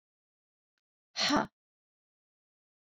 {
  "exhalation_length": "2.8 s",
  "exhalation_amplitude": 6490,
  "exhalation_signal_mean_std_ratio": 0.24,
  "survey_phase": "beta (2021-08-13 to 2022-03-07)",
  "age": "65+",
  "gender": "Female",
  "wearing_mask": "No",
  "symptom_none": true,
  "smoker_status": "Never smoked",
  "respiratory_condition_asthma": false,
  "respiratory_condition_other": false,
  "recruitment_source": "REACT",
  "submission_delay": "3 days",
  "covid_test_result": "Negative",
  "covid_test_method": "RT-qPCR"
}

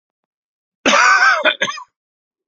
{
  "cough_length": "2.5 s",
  "cough_amplitude": 31831,
  "cough_signal_mean_std_ratio": 0.47,
  "survey_phase": "beta (2021-08-13 to 2022-03-07)",
  "age": "45-64",
  "gender": "Male",
  "wearing_mask": "No",
  "symptom_cough_any": true,
  "smoker_status": "Never smoked",
  "respiratory_condition_asthma": false,
  "respiratory_condition_other": false,
  "recruitment_source": "REACT",
  "submission_delay": "4 days",
  "covid_test_result": "Positive",
  "covid_test_method": "RT-qPCR",
  "covid_ct_value": 25.0,
  "covid_ct_gene": "N gene",
  "influenza_a_test_result": "Negative",
  "influenza_b_test_result": "Negative"
}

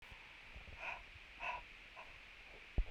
{
  "exhalation_length": "2.9 s",
  "exhalation_amplitude": 1813,
  "exhalation_signal_mean_std_ratio": 0.53,
  "survey_phase": "beta (2021-08-13 to 2022-03-07)",
  "age": "45-64",
  "gender": "Female",
  "wearing_mask": "No",
  "symptom_none": true,
  "smoker_status": "Never smoked",
  "respiratory_condition_asthma": true,
  "respiratory_condition_other": false,
  "recruitment_source": "REACT",
  "submission_delay": "2 days",
  "covid_test_result": "Negative",
  "covid_test_method": "RT-qPCR",
  "influenza_a_test_result": "Negative",
  "influenza_b_test_result": "Negative"
}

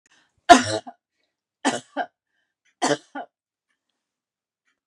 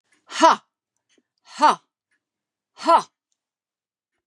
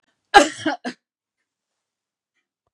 {
  "three_cough_length": "4.9 s",
  "three_cough_amplitude": 32768,
  "three_cough_signal_mean_std_ratio": 0.21,
  "exhalation_length": "4.3 s",
  "exhalation_amplitude": 28281,
  "exhalation_signal_mean_std_ratio": 0.26,
  "cough_length": "2.7 s",
  "cough_amplitude": 32768,
  "cough_signal_mean_std_ratio": 0.21,
  "survey_phase": "beta (2021-08-13 to 2022-03-07)",
  "age": "65+",
  "gender": "Female",
  "wearing_mask": "No",
  "symptom_none": true,
  "smoker_status": "Never smoked",
  "respiratory_condition_asthma": false,
  "respiratory_condition_other": false,
  "recruitment_source": "REACT",
  "submission_delay": "2 days",
  "covid_test_result": "Negative",
  "covid_test_method": "RT-qPCR",
  "influenza_a_test_result": "Negative",
  "influenza_b_test_result": "Negative"
}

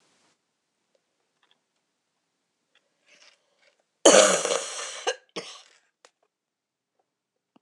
{
  "cough_length": "7.6 s",
  "cough_amplitude": 25882,
  "cough_signal_mean_std_ratio": 0.22,
  "survey_phase": "beta (2021-08-13 to 2022-03-07)",
  "age": "45-64",
  "gender": "Female",
  "wearing_mask": "No",
  "symptom_cough_any": true,
  "symptom_runny_or_blocked_nose": true,
  "symptom_fatigue": true,
  "symptom_fever_high_temperature": true,
  "symptom_change_to_sense_of_smell_or_taste": true,
  "symptom_onset": "3 days",
  "smoker_status": "Never smoked",
  "respiratory_condition_asthma": false,
  "respiratory_condition_other": false,
  "recruitment_source": "Test and Trace",
  "submission_delay": "1 day",
  "covid_test_result": "Positive",
  "covid_test_method": "ePCR"
}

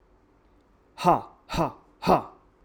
{
  "exhalation_length": "2.6 s",
  "exhalation_amplitude": 17607,
  "exhalation_signal_mean_std_ratio": 0.35,
  "survey_phase": "alpha (2021-03-01 to 2021-08-12)",
  "age": "18-44",
  "gender": "Male",
  "wearing_mask": "No",
  "symptom_none": true,
  "smoker_status": "Never smoked",
  "respiratory_condition_asthma": false,
  "respiratory_condition_other": false,
  "recruitment_source": "REACT",
  "submission_delay": "2 days",
  "covid_test_result": "Negative",
  "covid_test_method": "RT-qPCR"
}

